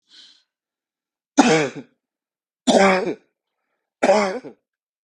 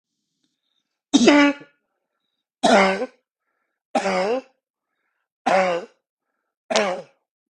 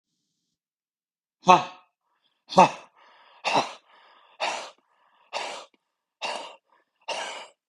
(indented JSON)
{
  "three_cough_length": "5.0 s",
  "three_cough_amplitude": 32768,
  "three_cough_signal_mean_std_ratio": 0.37,
  "cough_length": "7.6 s",
  "cough_amplitude": 31828,
  "cough_signal_mean_std_ratio": 0.38,
  "exhalation_length": "7.7 s",
  "exhalation_amplitude": 32591,
  "exhalation_signal_mean_std_ratio": 0.25,
  "survey_phase": "beta (2021-08-13 to 2022-03-07)",
  "age": "45-64",
  "gender": "Male",
  "wearing_mask": "No",
  "symptom_none": true,
  "smoker_status": "Prefer not to say",
  "respiratory_condition_asthma": false,
  "respiratory_condition_other": false,
  "recruitment_source": "REACT",
  "submission_delay": "2 days",
  "covid_test_result": "Negative",
  "covid_test_method": "RT-qPCR",
  "influenza_a_test_result": "Negative",
  "influenza_b_test_result": "Negative"
}